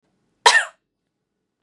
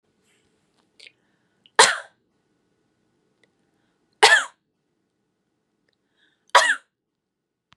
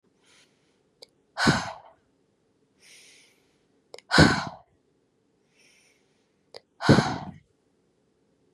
{"cough_length": "1.6 s", "cough_amplitude": 32768, "cough_signal_mean_std_ratio": 0.25, "three_cough_length": "7.8 s", "three_cough_amplitude": 32313, "three_cough_signal_mean_std_ratio": 0.2, "exhalation_length": "8.5 s", "exhalation_amplitude": 24677, "exhalation_signal_mean_std_ratio": 0.25, "survey_phase": "beta (2021-08-13 to 2022-03-07)", "age": "18-44", "gender": "Female", "wearing_mask": "No", "symptom_cough_any": true, "symptom_runny_or_blocked_nose": true, "symptom_fatigue": true, "symptom_loss_of_taste": true, "smoker_status": "Never smoked", "respiratory_condition_asthma": false, "respiratory_condition_other": false, "recruitment_source": "Test and Trace", "submission_delay": "2 days", "covid_test_result": "Positive", "covid_test_method": "RT-qPCR", "covid_ct_value": 20.6, "covid_ct_gene": "N gene"}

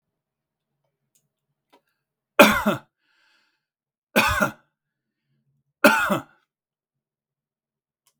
{"three_cough_length": "8.2 s", "three_cough_amplitude": 32768, "three_cough_signal_mean_std_ratio": 0.24, "survey_phase": "beta (2021-08-13 to 2022-03-07)", "age": "65+", "gender": "Male", "wearing_mask": "No", "symptom_fatigue": true, "smoker_status": "Ex-smoker", "respiratory_condition_asthma": false, "respiratory_condition_other": false, "recruitment_source": "REACT", "submission_delay": "2 days", "covid_test_result": "Negative", "covid_test_method": "RT-qPCR", "influenza_a_test_result": "Negative", "influenza_b_test_result": "Negative"}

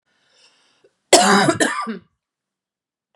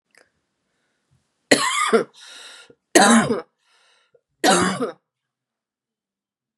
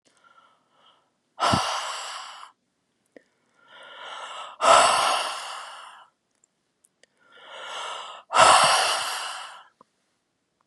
{"cough_length": "3.2 s", "cough_amplitude": 32768, "cough_signal_mean_std_ratio": 0.36, "three_cough_length": "6.6 s", "three_cough_amplitude": 32768, "three_cough_signal_mean_std_ratio": 0.35, "exhalation_length": "10.7 s", "exhalation_amplitude": 29133, "exhalation_signal_mean_std_ratio": 0.39, "survey_phase": "beta (2021-08-13 to 2022-03-07)", "age": "45-64", "gender": "Female", "wearing_mask": "No", "symptom_cough_any": true, "symptom_runny_or_blocked_nose": true, "symptom_fatigue": true, "smoker_status": "Never smoked", "respiratory_condition_asthma": false, "respiratory_condition_other": false, "recruitment_source": "REACT", "submission_delay": "1 day", "covid_test_result": "Positive", "covid_test_method": "RT-qPCR", "covid_ct_value": 37.0, "covid_ct_gene": "N gene", "influenza_a_test_result": "Negative", "influenza_b_test_result": "Negative"}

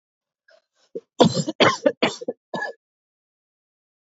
{"cough_length": "4.0 s", "cough_amplitude": 27212, "cough_signal_mean_std_ratio": 0.31, "survey_phase": "beta (2021-08-13 to 2022-03-07)", "age": "45-64", "gender": "Female", "wearing_mask": "No", "symptom_cough_any": true, "symptom_new_continuous_cough": true, "symptom_runny_or_blocked_nose": true, "symptom_headache": true, "smoker_status": "Never smoked", "respiratory_condition_asthma": false, "respiratory_condition_other": false, "recruitment_source": "Test and Trace", "submission_delay": "2 days", "covid_test_result": "Positive", "covid_test_method": "ePCR"}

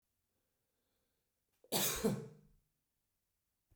{"cough_length": "3.8 s", "cough_amplitude": 3955, "cough_signal_mean_std_ratio": 0.29, "survey_phase": "beta (2021-08-13 to 2022-03-07)", "age": "45-64", "gender": "Male", "wearing_mask": "No", "symptom_none": true, "smoker_status": "Never smoked", "respiratory_condition_asthma": false, "respiratory_condition_other": false, "recruitment_source": "REACT", "submission_delay": "1 day", "covid_test_result": "Negative", "covid_test_method": "RT-qPCR"}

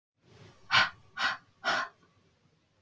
{"exhalation_length": "2.8 s", "exhalation_amplitude": 9792, "exhalation_signal_mean_std_ratio": 0.36, "survey_phase": "beta (2021-08-13 to 2022-03-07)", "age": "45-64", "gender": "Female", "wearing_mask": "No", "symptom_none": true, "smoker_status": "Never smoked", "respiratory_condition_asthma": false, "respiratory_condition_other": false, "recruitment_source": "REACT", "submission_delay": "4 days", "covid_test_result": "Negative", "covid_test_method": "RT-qPCR"}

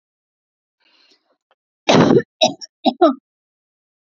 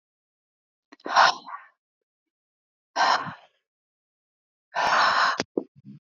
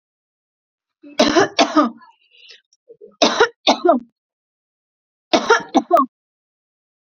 {"cough_length": "4.0 s", "cough_amplitude": 30256, "cough_signal_mean_std_ratio": 0.31, "exhalation_length": "6.1 s", "exhalation_amplitude": 19880, "exhalation_signal_mean_std_ratio": 0.36, "three_cough_length": "7.2 s", "three_cough_amplitude": 32455, "three_cough_signal_mean_std_ratio": 0.36, "survey_phase": "beta (2021-08-13 to 2022-03-07)", "age": "18-44", "gender": "Female", "wearing_mask": "No", "symptom_none": true, "smoker_status": "Never smoked", "respiratory_condition_asthma": false, "respiratory_condition_other": false, "recruitment_source": "REACT", "submission_delay": "1 day", "covid_test_result": "Negative", "covid_test_method": "RT-qPCR", "influenza_a_test_result": "Negative", "influenza_b_test_result": "Negative"}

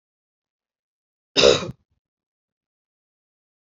{"cough_length": "3.8 s", "cough_amplitude": 27748, "cough_signal_mean_std_ratio": 0.19, "survey_phase": "beta (2021-08-13 to 2022-03-07)", "age": "45-64", "gender": "Female", "wearing_mask": "No", "symptom_runny_or_blocked_nose": true, "symptom_sore_throat": true, "symptom_other": true, "smoker_status": "Ex-smoker", "respiratory_condition_asthma": false, "respiratory_condition_other": false, "recruitment_source": "Test and Trace", "submission_delay": "1 day", "covid_test_result": "Positive", "covid_test_method": "RT-qPCR", "covid_ct_value": 23.3, "covid_ct_gene": "N gene"}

